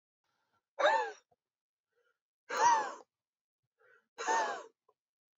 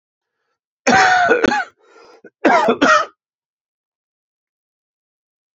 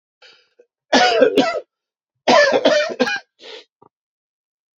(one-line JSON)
{"exhalation_length": "5.4 s", "exhalation_amplitude": 5394, "exhalation_signal_mean_std_ratio": 0.35, "cough_length": "5.5 s", "cough_amplitude": 32767, "cough_signal_mean_std_ratio": 0.4, "three_cough_length": "4.8 s", "three_cough_amplitude": 28874, "three_cough_signal_mean_std_ratio": 0.45, "survey_phase": "beta (2021-08-13 to 2022-03-07)", "age": "18-44", "gender": "Male", "wearing_mask": "No", "symptom_cough_any": true, "symptom_new_continuous_cough": true, "symptom_runny_or_blocked_nose": true, "symptom_fatigue": true, "symptom_fever_high_temperature": true, "symptom_headache": true, "symptom_other": true, "smoker_status": "Ex-smoker", "respiratory_condition_asthma": false, "respiratory_condition_other": false, "recruitment_source": "Test and Trace", "submission_delay": "2 days", "covid_test_result": "Positive", "covid_test_method": "LFT"}